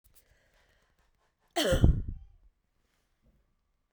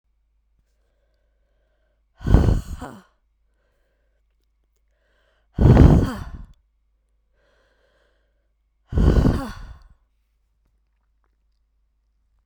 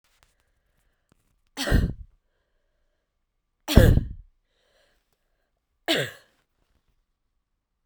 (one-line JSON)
{"cough_length": "3.9 s", "cough_amplitude": 14712, "cough_signal_mean_std_ratio": 0.28, "exhalation_length": "12.5 s", "exhalation_amplitude": 32767, "exhalation_signal_mean_std_ratio": 0.27, "three_cough_length": "7.9 s", "three_cough_amplitude": 32767, "three_cough_signal_mean_std_ratio": 0.23, "survey_phase": "beta (2021-08-13 to 2022-03-07)", "age": "18-44", "gender": "Female", "wearing_mask": "Yes", "symptom_cough_any": true, "symptom_new_continuous_cough": true, "symptom_runny_or_blocked_nose": true, "symptom_shortness_of_breath": true, "symptom_sore_throat": true, "symptom_fatigue": true, "symptom_headache": true, "symptom_loss_of_taste": true, "symptom_other": true, "symptom_onset": "4 days", "smoker_status": "Prefer not to say", "respiratory_condition_asthma": false, "respiratory_condition_other": false, "recruitment_source": "Test and Trace", "submission_delay": "1 day", "covid_test_result": "Positive", "covid_test_method": "RT-qPCR", "covid_ct_value": 22.8, "covid_ct_gene": "ORF1ab gene"}